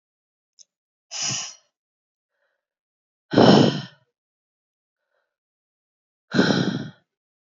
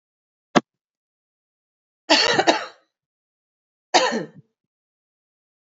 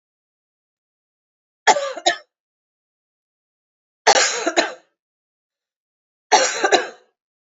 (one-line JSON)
{"exhalation_length": "7.6 s", "exhalation_amplitude": 29196, "exhalation_signal_mean_std_ratio": 0.28, "cough_length": "5.7 s", "cough_amplitude": 32767, "cough_signal_mean_std_ratio": 0.27, "three_cough_length": "7.5 s", "three_cough_amplitude": 31472, "three_cough_signal_mean_std_ratio": 0.31, "survey_phase": "beta (2021-08-13 to 2022-03-07)", "age": "45-64", "gender": "Female", "wearing_mask": "No", "symptom_cough_any": true, "symptom_runny_or_blocked_nose": true, "symptom_sore_throat": true, "symptom_fatigue": true, "symptom_headache": true, "symptom_onset": "5 days", "smoker_status": "Prefer not to say", "respiratory_condition_asthma": false, "respiratory_condition_other": false, "recruitment_source": "Test and Trace", "submission_delay": "1 day", "covid_test_result": "Positive", "covid_test_method": "RT-qPCR"}